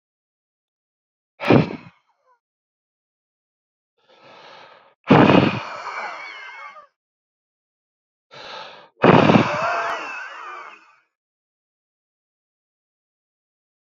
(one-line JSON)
{"exhalation_length": "13.9 s", "exhalation_amplitude": 31461, "exhalation_signal_mean_std_ratio": 0.29, "survey_phase": "beta (2021-08-13 to 2022-03-07)", "age": "18-44", "gender": "Male", "wearing_mask": "No", "symptom_shortness_of_breath": true, "symptom_fatigue": true, "symptom_change_to_sense_of_smell_or_taste": true, "symptom_onset": "6 days", "smoker_status": "Ex-smoker", "respiratory_condition_asthma": false, "respiratory_condition_other": false, "recruitment_source": "Test and Trace", "submission_delay": "2 days", "covid_test_result": "Positive", "covid_test_method": "RT-qPCR", "covid_ct_value": 21.8, "covid_ct_gene": "ORF1ab gene", "covid_ct_mean": 22.0, "covid_viral_load": "60000 copies/ml", "covid_viral_load_category": "Low viral load (10K-1M copies/ml)"}